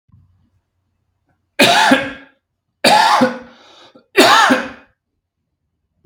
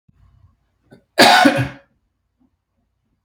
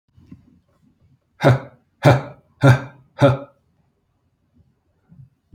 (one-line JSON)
{"three_cough_length": "6.1 s", "three_cough_amplitude": 32768, "three_cough_signal_mean_std_ratio": 0.42, "cough_length": "3.2 s", "cough_amplitude": 32768, "cough_signal_mean_std_ratio": 0.31, "exhalation_length": "5.5 s", "exhalation_amplitude": 32766, "exhalation_signal_mean_std_ratio": 0.29, "survey_phase": "beta (2021-08-13 to 2022-03-07)", "age": "45-64", "gender": "Male", "wearing_mask": "No", "symptom_none": true, "smoker_status": "Never smoked", "respiratory_condition_asthma": false, "respiratory_condition_other": false, "recruitment_source": "REACT", "submission_delay": "2 days", "covid_test_result": "Negative", "covid_test_method": "RT-qPCR", "influenza_a_test_result": "Negative", "influenza_b_test_result": "Negative"}